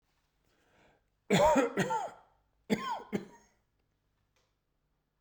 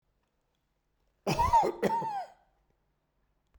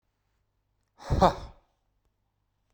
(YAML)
three_cough_length: 5.2 s
three_cough_amplitude: 6656
three_cough_signal_mean_std_ratio: 0.35
cough_length: 3.6 s
cough_amplitude: 7396
cough_signal_mean_std_ratio: 0.39
exhalation_length: 2.7 s
exhalation_amplitude: 15334
exhalation_signal_mean_std_ratio: 0.23
survey_phase: beta (2021-08-13 to 2022-03-07)
age: 45-64
gender: Male
wearing_mask: 'No'
symptom_none: true
smoker_status: Never smoked
respiratory_condition_asthma: true
respiratory_condition_other: false
recruitment_source: REACT
submission_delay: 1 day
covid_test_result: Negative
covid_test_method: RT-qPCR